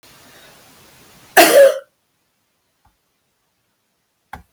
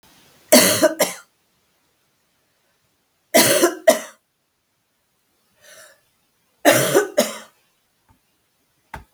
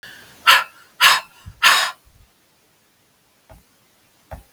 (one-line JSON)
{"cough_length": "4.5 s", "cough_amplitude": 32768, "cough_signal_mean_std_ratio": 0.25, "three_cough_length": "9.1 s", "three_cough_amplitude": 32768, "three_cough_signal_mean_std_ratio": 0.32, "exhalation_length": "4.5 s", "exhalation_amplitude": 32768, "exhalation_signal_mean_std_ratio": 0.31, "survey_phase": "beta (2021-08-13 to 2022-03-07)", "age": "45-64", "gender": "Female", "wearing_mask": "No", "symptom_cough_any": true, "symptom_runny_or_blocked_nose": true, "symptom_sore_throat": true, "symptom_fatigue": true, "symptom_change_to_sense_of_smell_or_taste": true, "symptom_loss_of_taste": true, "symptom_other": true, "smoker_status": "Never smoked", "respiratory_condition_asthma": false, "respiratory_condition_other": false, "recruitment_source": "Test and Trace", "submission_delay": "1 day", "covid_test_result": "Positive", "covid_test_method": "RT-qPCR", "covid_ct_value": 19.8, "covid_ct_gene": "N gene"}